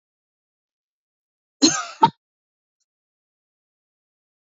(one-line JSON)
{"cough_length": "4.5 s", "cough_amplitude": 27155, "cough_signal_mean_std_ratio": 0.17, "survey_phase": "beta (2021-08-13 to 2022-03-07)", "age": "45-64", "gender": "Female", "wearing_mask": "No", "symptom_none": true, "symptom_onset": "12 days", "smoker_status": "Never smoked", "respiratory_condition_asthma": false, "respiratory_condition_other": false, "recruitment_source": "REACT", "submission_delay": "1 day", "covid_test_result": "Negative", "covid_test_method": "RT-qPCR"}